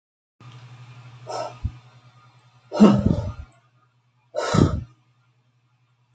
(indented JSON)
{
  "exhalation_length": "6.1 s",
  "exhalation_amplitude": 26434,
  "exhalation_signal_mean_std_ratio": 0.32,
  "survey_phase": "beta (2021-08-13 to 2022-03-07)",
  "age": "65+",
  "gender": "Female",
  "wearing_mask": "No",
  "symptom_none": true,
  "smoker_status": "Never smoked",
  "respiratory_condition_asthma": false,
  "respiratory_condition_other": false,
  "recruitment_source": "REACT",
  "submission_delay": "2 days",
  "covid_test_result": "Negative",
  "covid_test_method": "RT-qPCR"
}